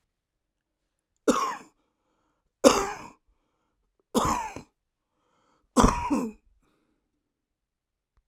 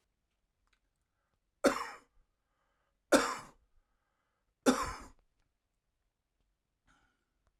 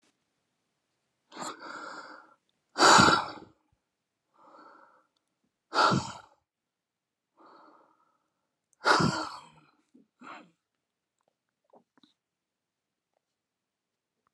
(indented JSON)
{
  "cough_length": "8.3 s",
  "cough_amplitude": 32767,
  "cough_signal_mean_std_ratio": 0.28,
  "three_cough_length": "7.6 s",
  "three_cough_amplitude": 8949,
  "three_cough_signal_mean_std_ratio": 0.21,
  "exhalation_length": "14.3 s",
  "exhalation_amplitude": 16558,
  "exhalation_signal_mean_std_ratio": 0.24,
  "survey_phase": "alpha (2021-03-01 to 2021-08-12)",
  "age": "45-64",
  "gender": "Male",
  "wearing_mask": "No",
  "symptom_cough_any": true,
  "symptom_shortness_of_breath": true,
  "symptom_abdominal_pain": true,
  "symptom_fatigue": true,
  "symptom_fever_high_temperature": true,
  "symptom_headache": true,
  "symptom_change_to_sense_of_smell_or_taste": true,
  "symptom_onset": "4 days",
  "smoker_status": "Ex-smoker",
  "respiratory_condition_asthma": false,
  "respiratory_condition_other": false,
  "recruitment_source": "Test and Trace",
  "submission_delay": "1 day",
  "covid_test_result": "Positive",
  "covid_test_method": "RT-qPCR",
  "covid_ct_value": 14.6,
  "covid_ct_gene": "ORF1ab gene"
}